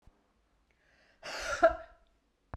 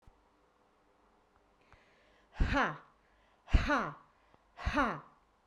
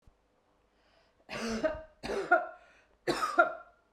{
  "cough_length": "2.6 s",
  "cough_amplitude": 9591,
  "cough_signal_mean_std_ratio": 0.26,
  "exhalation_length": "5.5 s",
  "exhalation_amplitude": 7883,
  "exhalation_signal_mean_std_ratio": 0.34,
  "three_cough_length": "3.9 s",
  "three_cough_amplitude": 10649,
  "three_cough_signal_mean_std_ratio": 0.4,
  "survey_phase": "beta (2021-08-13 to 2022-03-07)",
  "age": "45-64",
  "gender": "Female",
  "wearing_mask": "No",
  "symptom_none": true,
  "smoker_status": "Never smoked",
  "respiratory_condition_asthma": false,
  "respiratory_condition_other": false,
  "recruitment_source": "REACT",
  "submission_delay": "2 days",
  "covid_test_result": "Negative",
  "covid_test_method": "RT-qPCR"
}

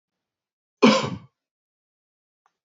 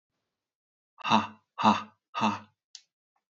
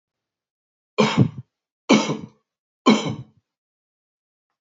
{
  "cough_length": "2.6 s",
  "cough_amplitude": 26361,
  "cough_signal_mean_std_ratio": 0.23,
  "exhalation_length": "3.3 s",
  "exhalation_amplitude": 12443,
  "exhalation_signal_mean_std_ratio": 0.32,
  "three_cough_length": "4.6 s",
  "three_cough_amplitude": 27491,
  "three_cough_signal_mean_std_ratio": 0.31,
  "survey_phase": "beta (2021-08-13 to 2022-03-07)",
  "age": "45-64",
  "gender": "Male",
  "wearing_mask": "No",
  "symptom_none": true,
  "smoker_status": "Never smoked",
  "respiratory_condition_asthma": false,
  "respiratory_condition_other": false,
  "recruitment_source": "REACT",
  "submission_delay": "1 day",
  "covid_test_result": "Negative",
  "covid_test_method": "RT-qPCR"
}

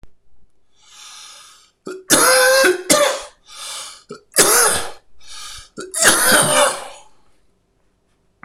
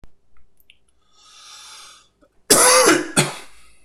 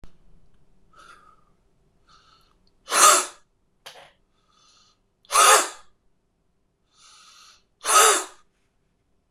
{
  "three_cough_length": "8.4 s",
  "three_cough_amplitude": 26028,
  "three_cough_signal_mean_std_ratio": 0.5,
  "cough_length": "3.8 s",
  "cough_amplitude": 26028,
  "cough_signal_mean_std_ratio": 0.39,
  "exhalation_length": "9.3 s",
  "exhalation_amplitude": 25754,
  "exhalation_signal_mean_std_ratio": 0.28,
  "survey_phase": "beta (2021-08-13 to 2022-03-07)",
  "age": "45-64",
  "gender": "Male",
  "wearing_mask": "No",
  "symptom_cough_any": true,
  "symptom_runny_or_blocked_nose": true,
  "symptom_abdominal_pain": true,
  "symptom_change_to_sense_of_smell_or_taste": true,
  "symptom_loss_of_taste": true,
  "smoker_status": "Prefer not to say",
  "respiratory_condition_asthma": false,
  "respiratory_condition_other": false,
  "recruitment_source": "Test and Trace",
  "submission_delay": "3 days",
  "covid_test_result": "Positive",
  "covid_test_method": "RT-qPCR",
  "covid_ct_value": 16.4,
  "covid_ct_gene": "ORF1ab gene",
  "covid_ct_mean": 16.8,
  "covid_viral_load": "3100000 copies/ml",
  "covid_viral_load_category": "High viral load (>1M copies/ml)"
}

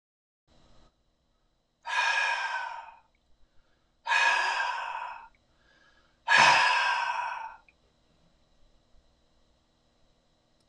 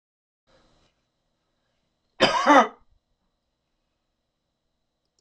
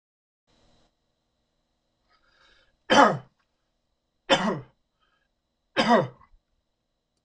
{
  "exhalation_length": "10.7 s",
  "exhalation_amplitude": 14382,
  "exhalation_signal_mean_std_ratio": 0.41,
  "cough_length": "5.2 s",
  "cough_amplitude": 26028,
  "cough_signal_mean_std_ratio": 0.21,
  "three_cough_length": "7.2 s",
  "three_cough_amplitude": 25007,
  "three_cough_signal_mean_std_ratio": 0.25,
  "survey_phase": "beta (2021-08-13 to 2022-03-07)",
  "age": "45-64",
  "gender": "Male",
  "wearing_mask": "No",
  "symptom_none": true,
  "smoker_status": "Never smoked",
  "respiratory_condition_asthma": false,
  "respiratory_condition_other": false,
  "recruitment_source": "REACT",
  "submission_delay": "2 days",
  "covid_test_result": "Negative",
  "covid_test_method": "RT-qPCR",
  "influenza_a_test_result": "Negative",
  "influenza_b_test_result": "Negative"
}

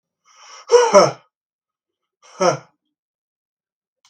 {
  "exhalation_length": "4.1 s",
  "exhalation_amplitude": 32768,
  "exhalation_signal_mean_std_ratio": 0.28,
  "survey_phase": "beta (2021-08-13 to 2022-03-07)",
  "age": "65+",
  "gender": "Male",
  "wearing_mask": "No",
  "symptom_none": true,
  "smoker_status": "Never smoked",
  "respiratory_condition_asthma": false,
  "respiratory_condition_other": false,
  "recruitment_source": "REACT",
  "submission_delay": "3 days",
  "covid_test_result": "Negative",
  "covid_test_method": "RT-qPCR",
  "influenza_a_test_result": "Negative",
  "influenza_b_test_result": "Negative"
}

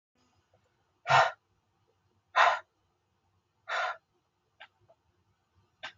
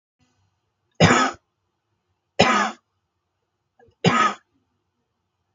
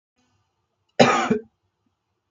{
  "exhalation_length": "6.0 s",
  "exhalation_amplitude": 10371,
  "exhalation_signal_mean_std_ratio": 0.25,
  "three_cough_length": "5.5 s",
  "three_cough_amplitude": 32766,
  "three_cough_signal_mean_std_ratio": 0.31,
  "cough_length": "2.3 s",
  "cough_amplitude": 32766,
  "cough_signal_mean_std_ratio": 0.3,
  "survey_phase": "beta (2021-08-13 to 2022-03-07)",
  "age": "18-44",
  "gender": "Male",
  "wearing_mask": "No",
  "symptom_none": true,
  "smoker_status": "Current smoker (1 to 10 cigarettes per day)",
  "respiratory_condition_asthma": false,
  "respiratory_condition_other": false,
  "recruitment_source": "REACT",
  "submission_delay": "0 days",
  "covid_test_result": "Negative",
  "covid_test_method": "RT-qPCR",
  "influenza_a_test_result": "Negative",
  "influenza_b_test_result": "Negative"
}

